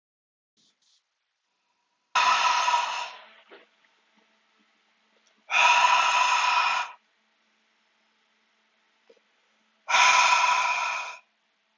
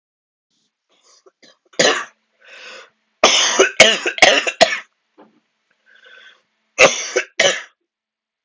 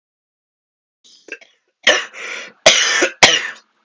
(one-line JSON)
{"exhalation_length": "11.8 s", "exhalation_amplitude": 16383, "exhalation_signal_mean_std_ratio": 0.45, "three_cough_length": "8.4 s", "three_cough_amplitude": 32768, "three_cough_signal_mean_std_ratio": 0.35, "cough_length": "3.8 s", "cough_amplitude": 32768, "cough_signal_mean_std_ratio": 0.37, "survey_phase": "alpha (2021-03-01 to 2021-08-12)", "age": "18-44", "gender": "Male", "wearing_mask": "No", "symptom_cough_any": true, "symptom_new_continuous_cough": true, "symptom_shortness_of_breath": true, "symptom_abdominal_pain": true, "symptom_fatigue": true, "symptom_fever_high_temperature": true, "symptom_headache": true, "symptom_onset": "6 days", "smoker_status": "Never smoked", "respiratory_condition_asthma": false, "respiratory_condition_other": false, "recruitment_source": "Test and Trace", "submission_delay": "1 day", "covid_test_result": "Positive", "covid_test_method": "RT-qPCR"}